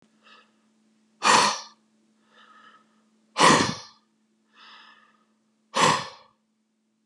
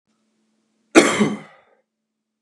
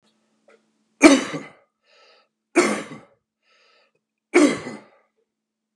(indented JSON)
{
  "exhalation_length": "7.1 s",
  "exhalation_amplitude": 23420,
  "exhalation_signal_mean_std_ratio": 0.3,
  "cough_length": "2.4 s",
  "cough_amplitude": 32768,
  "cough_signal_mean_std_ratio": 0.28,
  "three_cough_length": "5.8 s",
  "three_cough_amplitude": 32768,
  "three_cough_signal_mean_std_ratio": 0.27,
  "survey_phase": "beta (2021-08-13 to 2022-03-07)",
  "age": "45-64",
  "gender": "Male",
  "wearing_mask": "No",
  "symptom_none": true,
  "smoker_status": "Never smoked",
  "respiratory_condition_asthma": false,
  "respiratory_condition_other": false,
  "recruitment_source": "REACT",
  "submission_delay": "2 days",
  "covid_test_result": "Negative",
  "covid_test_method": "RT-qPCR",
  "influenza_a_test_result": "Negative",
  "influenza_b_test_result": "Negative"
}